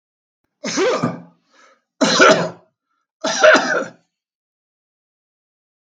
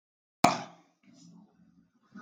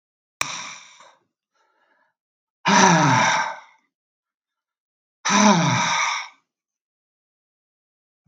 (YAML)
three_cough_length: 5.8 s
three_cough_amplitude: 32768
three_cough_signal_mean_std_ratio: 0.38
cough_length: 2.2 s
cough_amplitude: 21225
cough_signal_mean_std_ratio: 0.2
exhalation_length: 8.3 s
exhalation_amplitude: 32487
exhalation_signal_mean_std_ratio: 0.39
survey_phase: beta (2021-08-13 to 2022-03-07)
age: 45-64
gender: Male
wearing_mask: 'No'
symptom_none: true
symptom_onset: 11 days
smoker_status: Never smoked
respiratory_condition_asthma: false
respiratory_condition_other: false
recruitment_source: REACT
submission_delay: 0 days
covid_test_result: Negative
covid_test_method: RT-qPCR
influenza_a_test_result: Negative
influenza_b_test_result: Negative